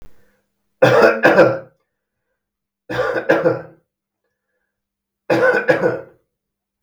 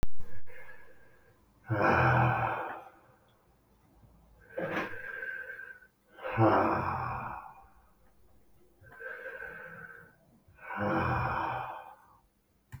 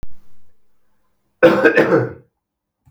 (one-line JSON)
{"three_cough_length": "6.8 s", "three_cough_amplitude": 32768, "three_cough_signal_mean_std_ratio": 0.42, "exhalation_length": "12.8 s", "exhalation_amplitude": 7348, "exhalation_signal_mean_std_ratio": 0.51, "cough_length": "2.9 s", "cough_amplitude": 32768, "cough_signal_mean_std_ratio": 0.44, "survey_phase": "beta (2021-08-13 to 2022-03-07)", "age": "45-64", "gender": "Male", "wearing_mask": "No", "symptom_none": true, "smoker_status": "Never smoked", "respiratory_condition_asthma": false, "respiratory_condition_other": false, "recruitment_source": "REACT", "submission_delay": "2 days", "covid_test_result": "Negative", "covid_test_method": "RT-qPCR", "influenza_a_test_result": "Negative", "influenza_b_test_result": "Negative"}